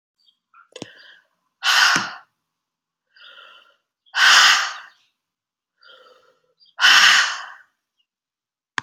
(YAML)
exhalation_length: 8.8 s
exhalation_amplitude: 32379
exhalation_signal_mean_std_ratio: 0.34
survey_phase: beta (2021-08-13 to 2022-03-07)
age: 65+
gender: Female
wearing_mask: 'No'
symptom_cough_any: true
symptom_onset: 3 days
smoker_status: Ex-smoker
respiratory_condition_asthma: false
respiratory_condition_other: false
recruitment_source: Test and Trace
submission_delay: 2 days
covid_test_result: Positive
covid_test_method: RT-qPCR
covid_ct_value: 15.5
covid_ct_gene: ORF1ab gene
covid_ct_mean: 15.7
covid_viral_load: 6900000 copies/ml
covid_viral_load_category: High viral load (>1M copies/ml)